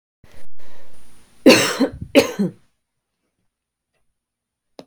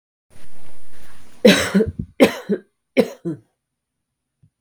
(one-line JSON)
{"cough_length": "4.9 s", "cough_amplitude": 32768, "cough_signal_mean_std_ratio": 0.43, "three_cough_length": "4.6 s", "three_cough_amplitude": 32766, "three_cough_signal_mean_std_ratio": 0.53, "survey_phase": "beta (2021-08-13 to 2022-03-07)", "age": "18-44", "gender": "Female", "wearing_mask": "No", "symptom_runny_or_blocked_nose": true, "symptom_onset": "3 days", "smoker_status": "Never smoked", "respiratory_condition_asthma": false, "respiratory_condition_other": false, "recruitment_source": "Test and Trace", "submission_delay": "2 days", "covid_test_result": "Positive", "covid_test_method": "RT-qPCR"}